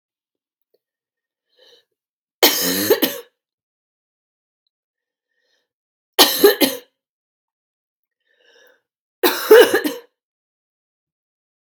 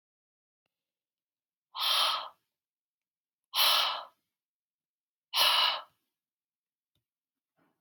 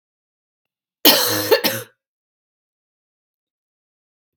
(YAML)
three_cough_length: 11.7 s
three_cough_amplitude: 32768
three_cough_signal_mean_std_ratio: 0.26
exhalation_length: 7.8 s
exhalation_amplitude: 10340
exhalation_signal_mean_std_ratio: 0.33
cough_length: 4.4 s
cough_amplitude: 32768
cough_signal_mean_std_ratio: 0.28
survey_phase: beta (2021-08-13 to 2022-03-07)
age: 18-44
gender: Female
wearing_mask: 'No'
symptom_cough_any: true
symptom_runny_or_blocked_nose: true
symptom_fatigue: true
symptom_headache: true
symptom_change_to_sense_of_smell_or_taste: true
symptom_onset: 6 days
smoker_status: Never smoked
respiratory_condition_asthma: false
respiratory_condition_other: false
recruitment_source: Test and Trace
submission_delay: 2 days
covid_test_result: Positive
covid_test_method: RT-qPCR
covid_ct_value: 19.7
covid_ct_gene: ORF1ab gene
covid_ct_mean: 19.9
covid_viral_load: 300000 copies/ml
covid_viral_load_category: Low viral load (10K-1M copies/ml)